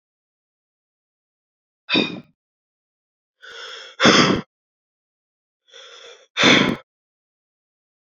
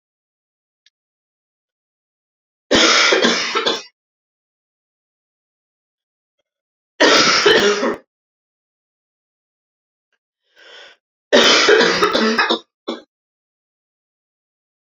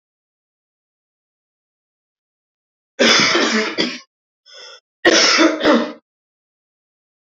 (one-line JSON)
{"exhalation_length": "8.1 s", "exhalation_amplitude": 30756, "exhalation_signal_mean_std_ratio": 0.28, "three_cough_length": "14.9 s", "three_cough_amplitude": 32768, "three_cough_signal_mean_std_ratio": 0.38, "cough_length": "7.3 s", "cough_amplitude": 29586, "cough_signal_mean_std_ratio": 0.39, "survey_phase": "beta (2021-08-13 to 2022-03-07)", "age": "18-44", "gender": "Female", "wearing_mask": "No", "symptom_cough_any": true, "symptom_new_continuous_cough": true, "symptom_runny_or_blocked_nose": true, "symptom_sore_throat": true, "symptom_fatigue": true, "symptom_headache": true, "smoker_status": "Never smoked", "respiratory_condition_asthma": true, "respiratory_condition_other": false, "recruitment_source": "Test and Trace", "submission_delay": "-1 day", "covid_test_result": "Positive", "covid_test_method": "LFT"}